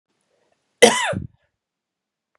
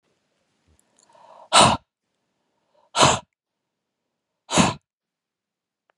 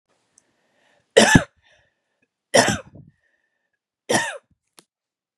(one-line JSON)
{"cough_length": "2.4 s", "cough_amplitude": 32768, "cough_signal_mean_std_ratio": 0.25, "exhalation_length": "6.0 s", "exhalation_amplitude": 32668, "exhalation_signal_mean_std_ratio": 0.25, "three_cough_length": "5.4 s", "three_cough_amplitude": 32768, "three_cough_signal_mean_std_ratio": 0.25, "survey_phase": "beta (2021-08-13 to 2022-03-07)", "age": "45-64", "gender": "Female", "wearing_mask": "No", "symptom_runny_or_blocked_nose": true, "symptom_headache": true, "smoker_status": "Ex-smoker", "respiratory_condition_asthma": true, "respiratory_condition_other": false, "recruitment_source": "REACT", "submission_delay": "3 days", "covid_test_result": "Negative", "covid_test_method": "RT-qPCR", "influenza_a_test_result": "Negative", "influenza_b_test_result": "Negative"}